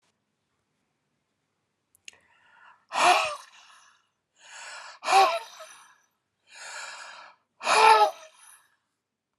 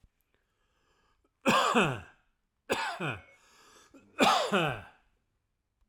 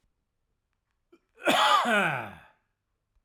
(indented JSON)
{
  "exhalation_length": "9.4 s",
  "exhalation_amplitude": 17018,
  "exhalation_signal_mean_std_ratio": 0.31,
  "three_cough_length": "5.9 s",
  "three_cough_amplitude": 11142,
  "three_cough_signal_mean_std_ratio": 0.4,
  "cough_length": "3.2 s",
  "cough_amplitude": 14130,
  "cough_signal_mean_std_ratio": 0.41,
  "survey_phase": "alpha (2021-03-01 to 2021-08-12)",
  "age": "45-64",
  "gender": "Male",
  "wearing_mask": "No",
  "symptom_none": true,
  "symptom_onset": "7 days",
  "smoker_status": "Never smoked",
  "respiratory_condition_asthma": false,
  "respiratory_condition_other": false,
  "recruitment_source": "REACT",
  "submission_delay": "2 days",
  "covid_test_result": "Negative",
  "covid_test_method": "RT-qPCR"
}